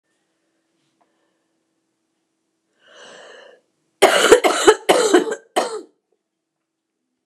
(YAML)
cough_length: 7.3 s
cough_amplitude: 29204
cough_signal_mean_std_ratio: 0.31
survey_phase: beta (2021-08-13 to 2022-03-07)
age: 65+
gender: Female
wearing_mask: 'No'
symptom_cough_any: true
symptom_runny_or_blocked_nose: true
symptom_sore_throat: true
symptom_fatigue: true
symptom_headache: true
symptom_change_to_sense_of_smell_or_taste: true
symptom_loss_of_taste: true
symptom_onset: 6 days
smoker_status: Never smoked
respiratory_condition_asthma: false
respiratory_condition_other: false
recruitment_source: Test and Trace
submission_delay: 2 days
covid_test_result: Positive
covid_test_method: RT-qPCR
covid_ct_value: 19.1
covid_ct_gene: ORF1ab gene